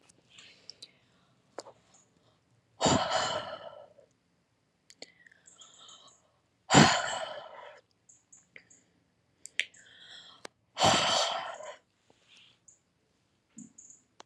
{"exhalation_length": "14.3 s", "exhalation_amplitude": 17202, "exhalation_signal_mean_std_ratio": 0.29, "survey_phase": "alpha (2021-03-01 to 2021-08-12)", "age": "18-44", "gender": "Female", "wearing_mask": "No", "symptom_none": true, "smoker_status": "Ex-smoker", "respiratory_condition_asthma": false, "respiratory_condition_other": false, "recruitment_source": "REACT", "submission_delay": "1 day", "covid_test_result": "Negative", "covid_test_method": "RT-qPCR"}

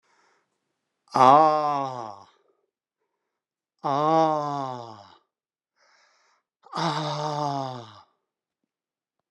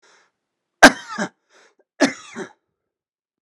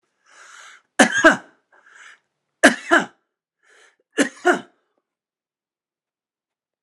{"exhalation_length": "9.3 s", "exhalation_amplitude": 26377, "exhalation_signal_mean_std_ratio": 0.35, "cough_length": "3.4 s", "cough_amplitude": 32768, "cough_signal_mean_std_ratio": 0.2, "three_cough_length": "6.8 s", "three_cough_amplitude": 32768, "three_cough_signal_mean_std_ratio": 0.25, "survey_phase": "beta (2021-08-13 to 2022-03-07)", "age": "45-64", "gender": "Male", "wearing_mask": "No", "symptom_none": true, "smoker_status": "Never smoked", "respiratory_condition_asthma": false, "respiratory_condition_other": true, "recruitment_source": "Test and Trace", "submission_delay": "1 day", "covid_test_result": "Negative", "covid_test_method": "RT-qPCR"}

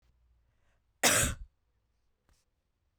{"cough_length": "3.0 s", "cough_amplitude": 8490, "cough_signal_mean_std_ratio": 0.26, "survey_phase": "beta (2021-08-13 to 2022-03-07)", "age": "45-64", "gender": "Female", "wearing_mask": "No", "symptom_none": true, "symptom_onset": "3 days", "smoker_status": "Never smoked", "respiratory_condition_asthma": false, "respiratory_condition_other": false, "recruitment_source": "REACT", "submission_delay": "2 days", "covid_test_result": "Negative", "covid_test_method": "RT-qPCR", "influenza_a_test_result": "Negative", "influenza_b_test_result": "Negative"}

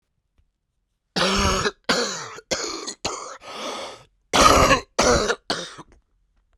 {"cough_length": "6.6 s", "cough_amplitude": 32768, "cough_signal_mean_std_ratio": 0.48, "survey_phase": "beta (2021-08-13 to 2022-03-07)", "age": "45-64", "gender": "Male", "wearing_mask": "No", "symptom_cough_any": true, "symptom_new_continuous_cough": true, "symptom_runny_or_blocked_nose": true, "symptom_sore_throat": true, "symptom_fatigue": true, "symptom_headache": true, "symptom_onset": "3 days", "smoker_status": "Current smoker (e-cigarettes or vapes only)", "respiratory_condition_asthma": false, "respiratory_condition_other": false, "recruitment_source": "Test and Trace", "submission_delay": "1 day", "covid_test_result": "Positive", "covid_test_method": "RT-qPCR", "covid_ct_value": 14.2, "covid_ct_gene": "ORF1ab gene", "covid_ct_mean": 14.6, "covid_viral_load": "17000000 copies/ml", "covid_viral_load_category": "High viral load (>1M copies/ml)"}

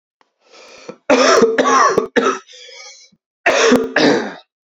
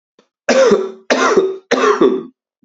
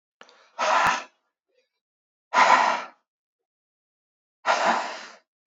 {"cough_length": "4.7 s", "cough_amplitude": 32767, "cough_signal_mean_std_ratio": 0.57, "three_cough_length": "2.6 s", "three_cough_amplitude": 29737, "three_cough_signal_mean_std_ratio": 0.64, "exhalation_length": "5.5 s", "exhalation_amplitude": 20359, "exhalation_signal_mean_std_ratio": 0.4, "survey_phase": "beta (2021-08-13 to 2022-03-07)", "age": "18-44", "gender": "Male", "wearing_mask": "No", "symptom_cough_any": true, "symptom_runny_or_blocked_nose": true, "symptom_sore_throat": true, "symptom_diarrhoea": true, "symptom_fatigue": true, "symptom_fever_high_temperature": true, "symptom_change_to_sense_of_smell_or_taste": true, "symptom_onset": "4 days", "smoker_status": "Never smoked", "respiratory_condition_asthma": false, "respiratory_condition_other": false, "recruitment_source": "Test and Trace", "submission_delay": "2 days", "covid_test_result": "Positive", "covid_test_method": "RT-qPCR", "covid_ct_value": 24.5, "covid_ct_gene": "ORF1ab gene", "covid_ct_mean": 25.0, "covid_viral_load": "6100 copies/ml", "covid_viral_load_category": "Minimal viral load (< 10K copies/ml)"}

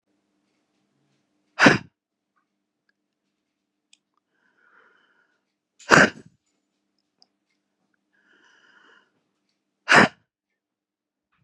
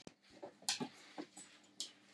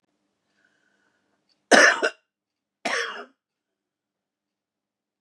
{"exhalation_length": "11.4 s", "exhalation_amplitude": 32768, "exhalation_signal_mean_std_ratio": 0.17, "three_cough_length": "2.1 s", "three_cough_amplitude": 4125, "three_cough_signal_mean_std_ratio": 0.42, "cough_length": "5.2 s", "cough_amplitude": 32494, "cough_signal_mean_std_ratio": 0.23, "survey_phase": "beta (2021-08-13 to 2022-03-07)", "age": "65+", "gender": "Female", "wearing_mask": "No", "symptom_cough_any": true, "symptom_runny_or_blocked_nose": true, "symptom_onset": "11 days", "smoker_status": "Current smoker (11 or more cigarettes per day)", "respiratory_condition_asthma": false, "respiratory_condition_other": false, "recruitment_source": "REACT", "submission_delay": "2 days", "covid_test_result": "Negative", "covid_test_method": "RT-qPCR", "influenza_a_test_result": "Negative", "influenza_b_test_result": "Negative"}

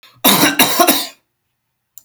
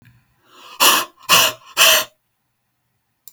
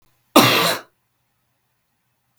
{"three_cough_length": "2.0 s", "three_cough_amplitude": 32768, "three_cough_signal_mean_std_ratio": 0.5, "exhalation_length": "3.3 s", "exhalation_amplitude": 32768, "exhalation_signal_mean_std_ratio": 0.39, "cough_length": "2.4 s", "cough_amplitude": 32768, "cough_signal_mean_std_ratio": 0.32, "survey_phase": "beta (2021-08-13 to 2022-03-07)", "age": "18-44", "gender": "Male", "wearing_mask": "No", "symptom_cough_any": true, "symptom_new_continuous_cough": true, "symptom_runny_or_blocked_nose": true, "symptom_sore_throat": true, "symptom_diarrhoea": true, "symptom_headache": true, "symptom_change_to_sense_of_smell_or_taste": true, "symptom_onset": "1 day", "smoker_status": "Never smoked", "respiratory_condition_asthma": false, "respiratory_condition_other": false, "recruitment_source": "Test and Trace", "submission_delay": "1 day", "covid_test_result": "Positive", "covid_test_method": "RT-qPCR", "covid_ct_value": 22.3, "covid_ct_gene": "S gene", "covid_ct_mean": 27.0, "covid_viral_load": "1400 copies/ml", "covid_viral_load_category": "Minimal viral load (< 10K copies/ml)"}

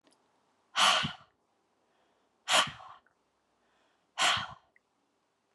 {"exhalation_length": "5.5 s", "exhalation_amplitude": 9703, "exhalation_signal_mean_std_ratio": 0.31, "survey_phase": "beta (2021-08-13 to 2022-03-07)", "age": "45-64", "gender": "Female", "wearing_mask": "No", "symptom_none": true, "smoker_status": "Ex-smoker", "respiratory_condition_asthma": false, "respiratory_condition_other": false, "recruitment_source": "REACT", "submission_delay": "2 days", "covid_test_result": "Negative", "covid_test_method": "RT-qPCR"}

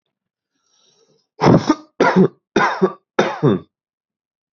{"three_cough_length": "4.5 s", "three_cough_amplitude": 32767, "three_cough_signal_mean_std_ratio": 0.4, "survey_phase": "beta (2021-08-13 to 2022-03-07)", "age": "18-44", "gender": "Male", "wearing_mask": "No", "symptom_none": true, "smoker_status": "Never smoked", "respiratory_condition_asthma": false, "respiratory_condition_other": false, "recruitment_source": "REACT", "submission_delay": "2 days", "covid_test_result": "Negative", "covid_test_method": "RT-qPCR", "influenza_a_test_result": "Negative", "influenza_b_test_result": "Negative"}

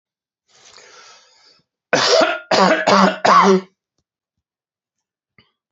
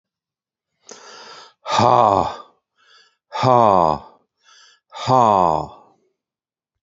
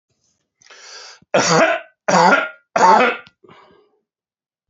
{"cough_length": "5.7 s", "cough_amplitude": 31184, "cough_signal_mean_std_ratio": 0.41, "exhalation_length": "6.8 s", "exhalation_amplitude": 28573, "exhalation_signal_mean_std_ratio": 0.38, "three_cough_length": "4.7 s", "three_cough_amplitude": 32767, "three_cough_signal_mean_std_ratio": 0.43, "survey_phase": "alpha (2021-03-01 to 2021-08-12)", "age": "45-64", "gender": "Male", "wearing_mask": "No", "symptom_none": true, "smoker_status": "Ex-smoker", "respiratory_condition_asthma": false, "respiratory_condition_other": false, "recruitment_source": "REACT", "submission_delay": "2 days", "covid_test_result": "Negative", "covid_test_method": "RT-qPCR"}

